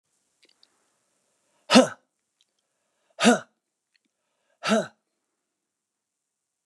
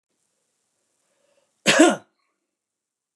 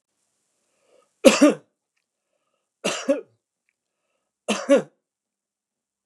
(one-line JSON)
{"exhalation_length": "6.7 s", "exhalation_amplitude": 25980, "exhalation_signal_mean_std_ratio": 0.21, "cough_length": "3.2 s", "cough_amplitude": 26493, "cough_signal_mean_std_ratio": 0.23, "three_cough_length": "6.1 s", "three_cough_amplitude": 32768, "three_cough_signal_mean_std_ratio": 0.24, "survey_phase": "beta (2021-08-13 to 2022-03-07)", "age": "65+", "gender": "Male", "wearing_mask": "No", "symptom_none": true, "smoker_status": "Ex-smoker", "respiratory_condition_asthma": false, "respiratory_condition_other": false, "recruitment_source": "REACT", "submission_delay": "12 days", "covid_test_result": "Negative", "covid_test_method": "RT-qPCR", "influenza_a_test_result": "Negative", "influenza_b_test_result": "Negative"}